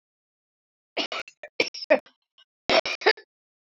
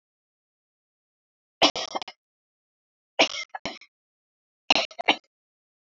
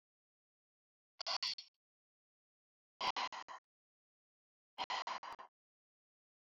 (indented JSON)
{
  "cough_length": "3.8 s",
  "cough_amplitude": 22634,
  "cough_signal_mean_std_ratio": 0.29,
  "three_cough_length": "6.0 s",
  "three_cough_amplitude": 26807,
  "three_cough_signal_mean_std_ratio": 0.22,
  "exhalation_length": "6.6 s",
  "exhalation_amplitude": 1916,
  "exhalation_signal_mean_std_ratio": 0.31,
  "survey_phase": "alpha (2021-03-01 to 2021-08-12)",
  "age": "45-64",
  "gender": "Female",
  "wearing_mask": "No",
  "symptom_cough_any": true,
  "symptom_onset": "5 days",
  "smoker_status": "Never smoked",
  "respiratory_condition_asthma": false,
  "respiratory_condition_other": false,
  "recruitment_source": "REACT",
  "submission_delay": "1 day",
  "covid_test_result": "Negative",
  "covid_test_method": "RT-qPCR"
}